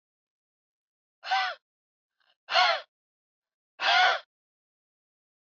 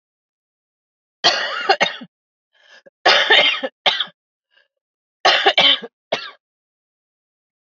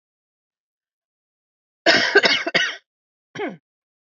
{"exhalation_length": "5.5 s", "exhalation_amplitude": 11866, "exhalation_signal_mean_std_ratio": 0.32, "three_cough_length": "7.7 s", "three_cough_amplitude": 29781, "three_cough_signal_mean_std_ratio": 0.38, "cough_length": "4.2 s", "cough_amplitude": 29821, "cough_signal_mean_std_ratio": 0.33, "survey_phase": "beta (2021-08-13 to 2022-03-07)", "age": "45-64", "gender": "Female", "wearing_mask": "Yes", "symptom_cough_any": true, "symptom_shortness_of_breath": true, "symptom_fatigue": true, "symptom_onset": "13 days", "smoker_status": "Never smoked", "respiratory_condition_asthma": false, "respiratory_condition_other": false, "recruitment_source": "REACT", "submission_delay": "2 days", "covid_test_result": "Negative", "covid_test_method": "RT-qPCR", "influenza_a_test_result": "Negative", "influenza_b_test_result": "Negative"}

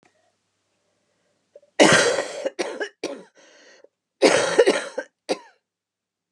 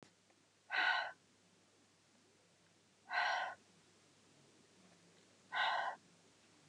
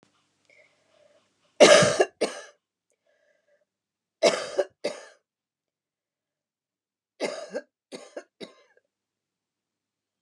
{"cough_length": "6.3 s", "cough_amplitude": 29340, "cough_signal_mean_std_ratio": 0.36, "exhalation_length": "6.7 s", "exhalation_amplitude": 2268, "exhalation_signal_mean_std_ratio": 0.39, "three_cough_length": "10.2 s", "three_cough_amplitude": 24930, "three_cough_signal_mean_std_ratio": 0.22, "survey_phase": "beta (2021-08-13 to 2022-03-07)", "age": "45-64", "gender": "Female", "wearing_mask": "No", "symptom_cough_any": true, "symptom_sore_throat": true, "symptom_fatigue": true, "symptom_headache": true, "symptom_change_to_sense_of_smell_or_taste": true, "symptom_loss_of_taste": true, "symptom_onset": "3 days", "smoker_status": "Prefer not to say", "respiratory_condition_asthma": false, "respiratory_condition_other": false, "recruitment_source": "Test and Trace", "submission_delay": "1 day", "covid_test_result": "Positive", "covid_test_method": "RT-qPCR", "covid_ct_value": 21.8, "covid_ct_gene": "ORF1ab gene", "covid_ct_mean": 22.0, "covid_viral_load": "60000 copies/ml", "covid_viral_load_category": "Low viral load (10K-1M copies/ml)"}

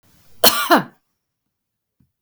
{"cough_length": "2.2 s", "cough_amplitude": 32768, "cough_signal_mean_std_ratio": 0.29, "survey_phase": "beta (2021-08-13 to 2022-03-07)", "age": "45-64", "gender": "Female", "wearing_mask": "No", "symptom_none": true, "smoker_status": "Ex-smoker", "respiratory_condition_asthma": false, "respiratory_condition_other": false, "recruitment_source": "REACT", "submission_delay": "1 day", "covid_test_result": "Negative", "covid_test_method": "RT-qPCR", "influenza_a_test_result": "Negative", "influenza_b_test_result": "Negative"}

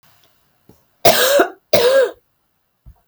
{"cough_length": "3.1 s", "cough_amplitude": 32768, "cough_signal_mean_std_ratio": 0.44, "survey_phase": "beta (2021-08-13 to 2022-03-07)", "age": "18-44", "gender": "Female", "wearing_mask": "No", "symptom_none": true, "smoker_status": "Ex-smoker", "respiratory_condition_asthma": false, "respiratory_condition_other": false, "recruitment_source": "REACT", "submission_delay": "1 day", "covid_test_result": "Negative", "covid_test_method": "RT-qPCR"}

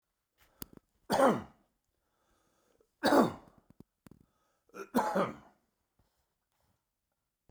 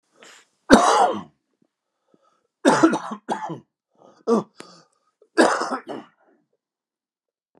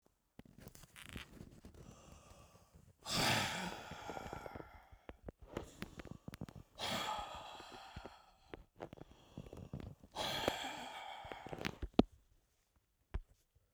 {"three_cough_length": "7.5 s", "three_cough_amplitude": 8927, "three_cough_signal_mean_std_ratio": 0.28, "cough_length": "7.6 s", "cough_amplitude": 29204, "cough_signal_mean_std_ratio": 0.34, "exhalation_length": "13.7 s", "exhalation_amplitude": 9395, "exhalation_signal_mean_std_ratio": 0.43, "survey_phase": "beta (2021-08-13 to 2022-03-07)", "age": "65+", "gender": "Male", "wearing_mask": "No", "symptom_cough_any": true, "symptom_runny_or_blocked_nose": true, "symptom_abdominal_pain": true, "symptom_fatigue": true, "symptom_headache": true, "symptom_onset": "3 days", "smoker_status": "Never smoked", "respiratory_condition_asthma": false, "respiratory_condition_other": false, "recruitment_source": "Test and Trace", "submission_delay": "2 days", "covid_test_result": "Positive", "covid_test_method": "RT-qPCR"}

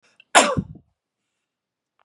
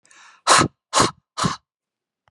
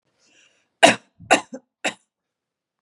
{"cough_length": "2.0 s", "cough_amplitude": 32767, "cough_signal_mean_std_ratio": 0.25, "exhalation_length": "2.3 s", "exhalation_amplitude": 29730, "exhalation_signal_mean_std_ratio": 0.37, "three_cough_length": "2.8 s", "three_cough_amplitude": 32767, "three_cough_signal_mean_std_ratio": 0.22, "survey_phase": "beta (2021-08-13 to 2022-03-07)", "age": "45-64", "gender": "Female", "wearing_mask": "No", "symptom_runny_or_blocked_nose": true, "smoker_status": "Never smoked", "respiratory_condition_asthma": false, "respiratory_condition_other": false, "recruitment_source": "REACT", "submission_delay": "1 day", "covid_test_result": "Negative", "covid_test_method": "RT-qPCR", "influenza_a_test_result": "Negative", "influenza_b_test_result": "Negative"}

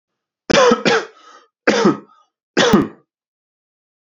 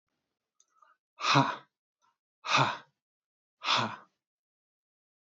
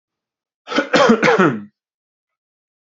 {"three_cough_length": "4.1 s", "three_cough_amplitude": 29252, "three_cough_signal_mean_std_ratio": 0.42, "exhalation_length": "5.3 s", "exhalation_amplitude": 11977, "exhalation_signal_mean_std_ratio": 0.31, "cough_length": "2.9 s", "cough_amplitude": 29829, "cough_signal_mean_std_ratio": 0.41, "survey_phase": "beta (2021-08-13 to 2022-03-07)", "age": "18-44", "gender": "Male", "wearing_mask": "No", "symptom_none": true, "smoker_status": "Never smoked", "respiratory_condition_asthma": true, "respiratory_condition_other": false, "recruitment_source": "REACT", "submission_delay": "1 day", "covid_test_result": "Negative", "covid_test_method": "RT-qPCR"}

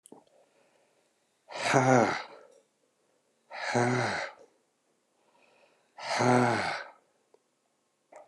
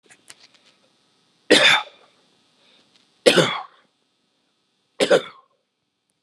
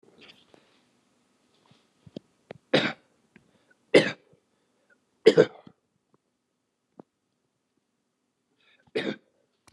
{"exhalation_length": "8.3 s", "exhalation_amplitude": 12706, "exhalation_signal_mean_std_ratio": 0.39, "three_cough_length": "6.2 s", "three_cough_amplitude": 29204, "three_cough_signal_mean_std_ratio": 0.28, "cough_length": "9.7 s", "cough_amplitude": 26650, "cough_signal_mean_std_ratio": 0.18, "survey_phase": "alpha (2021-03-01 to 2021-08-12)", "age": "65+", "gender": "Male", "wearing_mask": "No", "symptom_none": true, "smoker_status": "Never smoked", "respiratory_condition_asthma": false, "respiratory_condition_other": false, "recruitment_source": "REACT", "submission_delay": "3 days", "covid_test_result": "Negative", "covid_test_method": "RT-qPCR"}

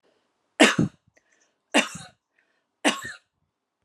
{"three_cough_length": "3.8 s", "three_cough_amplitude": 29354, "three_cough_signal_mean_std_ratio": 0.27, "survey_phase": "beta (2021-08-13 to 2022-03-07)", "age": "45-64", "gender": "Female", "wearing_mask": "No", "symptom_none": true, "smoker_status": "Ex-smoker", "respiratory_condition_asthma": false, "respiratory_condition_other": false, "recruitment_source": "REACT", "submission_delay": "2 days", "covid_test_result": "Negative", "covid_test_method": "RT-qPCR"}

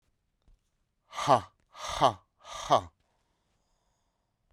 {"exhalation_length": "4.5 s", "exhalation_amplitude": 13443, "exhalation_signal_mean_std_ratio": 0.26, "survey_phase": "beta (2021-08-13 to 2022-03-07)", "age": "45-64", "gender": "Male", "wearing_mask": "No", "symptom_cough_any": true, "symptom_new_continuous_cough": true, "symptom_runny_or_blocked_nose": true, "symptom_sore_throat": true, "symptom_fatigue": true, "symptom_headache": true, "symptom_onset": "3 days", "smoker_status": "Current smoker (e-cigarettes or vapes only)", "respiratory_condition_asthma": false, "respiratory_condition_other": false, "recruitment_source": "Test and Trace", "submission_delay": "1 day", "covid_test_result": "Positive", "covid_test_method": "RT-qPCR", "covid_ct_value": 14.2, "covid_ct_gene": "ORF1ab gene", "covid_ct_mean": 14.6, "covid_viral_load": "17000000 copies/ml", "covid_viral_load_category": "High viral load (>1M copies/ml)"}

